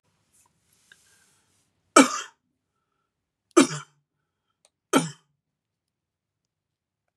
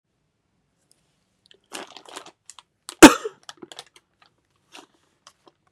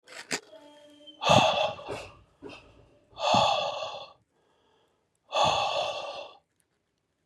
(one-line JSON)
{"three_cough_length": "7.2 s", "three_cough_amplitude": 32768, "three_cough_signal_mean_std_ratio": 0.17, "cough_length": "5.7 s", "cough_amplitude": 32768, "cough_signal_mean_std_ratio": 0.12, "exhalation_length": "7.3 s", "exhalation_amplitude": 17722, "exhalation_signal_mean_std_ratio": 0.45, "survey_phase": "beta (2021-08-13 to 2022-03-07)", "age": "45-64", "gender": "Male", "wearing_mask": "Yes", "symptom_none": true, "smoker_status": "Never smoked", "respiratory_condition_asthma": false, "respiratory_condition_other": false, "recruitment_source": "REACT", "submission_delay": "2 days", "covid_test_result": "Negative", "covid_test_method": "RT-qPCR", "influenza_a_test_result": "Negative", "influenza_b_test_result": "Negative"}